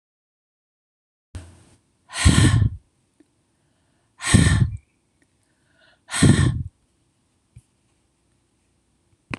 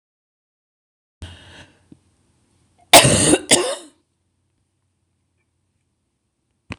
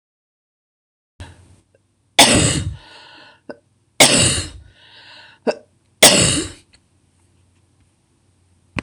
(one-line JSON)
{"exhalation_length": "9.4 s", "exhalation_amplitude": 26028, "exhalation_signal_mean_std_ratio": 0.31, "cough_length": "6.8 s", "cough_amplitude": 26028, "cough_signal_mean_std_ratio": 0.24, "three_cough_length": "8.8 s", "three_cough_amplitude": 26028, "three_cough_signal_mean_std_ratio": 0.32, "survey_phase": "alpha (2021-03-01 to 2021-08-12)", "age": "65+", "gender": "Female", "wearing_mask": "No", "symptom_none": true, "smoker_status": "Never smoked", "respiratory_condition_asthma": false, "respiratory_condition_other": false, "recruitment_source": "REACT", "submission_delay": "2 days", "covid_test_result": "Negative", "covid_test_method": "RT-qPCR"}